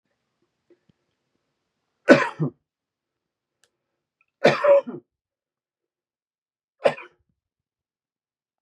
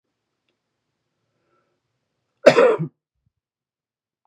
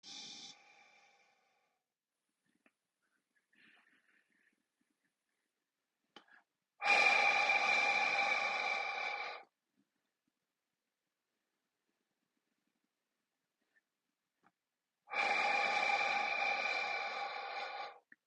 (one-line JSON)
{"three_cough_length": "8.6 s", "three_cough_amplitude": 31434, "three_cough_signal_mean_std_ratio": 0.21, "cough_length": "4.3 s", "cough_amplitude": 32768, "cough_signal_mean_std_ratio": 0.21, "exhalation_length": "18.3 s", "exhalation_amplitude": 4321, "exhalation_signal_mean_std_ratio": 0.44, "survey_phase": "beta (2021-08-13 to 2022-03-07)", "age": "18-44", "gender": "Male", "wearing_mask": "No", "symptom_none": true, "smoker_status": "Never smoked", "respiratory_condition_asthma": false, "respiratory_condition_other": false, "recruitment_source": "REACT", "submission_delay": "1 day", "covid_test_result": "Negative", "covid_test_method": "RT-qPCR", "influenza_a_test_result": "Negative", "influenza_b_test_result": "Negative"}